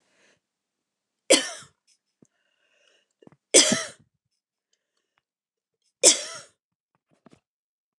three_cough_length: 8.0 s
three_cough_amplitude: 29204
three_cough_signal_mean_std_ratio: 0.2
survey_phase: beta (2021-08-13 to 2022-03-07)
age: 65+
gender: Female
wearing_mask: 'No'
symptom_none: true
smoker_status: Never smoked
respiratory_condition_asthma: false
respiratory_condition_other: false
recruitment_source: REACT
submission_delay: 8 days
covid_test_result: Negative
covid_test_method: RT-qPCR
influenza_a_test_result: Negative
influenza_b_test_result: Negative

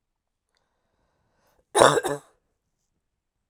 cough_length: 3.5 s
cough_amplitude: 32767
cough_signal_mean_std_ratio: 0.21
survey_phase: alpha (2021-03-01 to 2021-08-12)
age: 45-64
gender: Female
wearing_mask: 'No'
symptom_none: true
smoker_status: Never smoked
respiratory_condition_asthma: false
respiratory_condition_other: false
recruitment_source: REACT
submission_delay: 1 day
covid_test_result: Negative
covid_test_method: RT-qPCR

